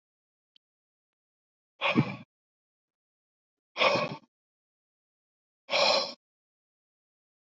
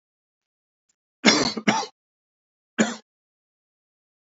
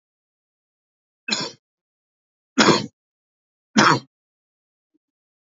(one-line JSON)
{"exhalation_length": "7.4 s", "exhalation_amplitude": 10784, "exhalation_signal_mean_std_ratio": 0.28, "cough_length": "4.3 s", "cough_amplitude": 27749, "cough_signal_mean_std_ratio": 0.27, "three_cough_length": "5.5 s", "three_cough_amplitude": 30143, "three_cough_signal_mean_std_ratio": 0.25, "survey_phase": "alpha (2021-03-01 to 2021-08-12)", "age": "65+", "gender": "Male", "wearing_mask": "Yes", "symptom_cough_any": true, "symptom_diarrhoea": true, "symptom_change_to_sense_of_smell_or_taste": true, "symptom_loss_of_taste": true, "symptom_onset": "6 days", "smoker_status": "Never smoked", "respiratory_condition_asthma": false, "respiratory_condition_other": false, "recruitment_source": "Test and Trace", "submission_delay": "2 days", "covid_test_result": "Positive", "covid_test_method": "RT-qPCR"}